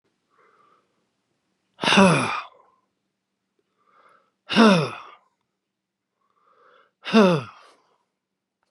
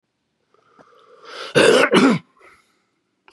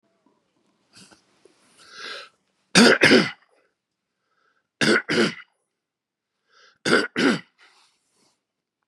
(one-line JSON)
{"exhalation_length": "8.7 s", "exhalation_amplitude": 29321, "exhalation_signal_mean_std_ratio": 0.29, "cough_length": "3.3 s", "cough_amplitude": 31277, "cough_signal_mean_std_ratio": 0.37, "three_cough_length": "8.9 s", "three_cough_amplitude": 32419, "three_cough_signal_mean_std_ratio": 0.3, "survey_phase": "beta (2021-08-13 to 2022-03-07)", "age": "65+", "gender": "Male", "wearing_mask": "No", "symptom_none": true, "smoker_status": "Ex-smoker", "respiratory_condition_asthma": false, "respiratory_condition_other": false, "recruitment_source": "REACT", "submission_delay": "1 day", "covid_test_result": "Negative", "covid_test_method": "RT-qPCR", "influenza_a_test_result": "Negative", "influenza_b_test_result": "Negative"}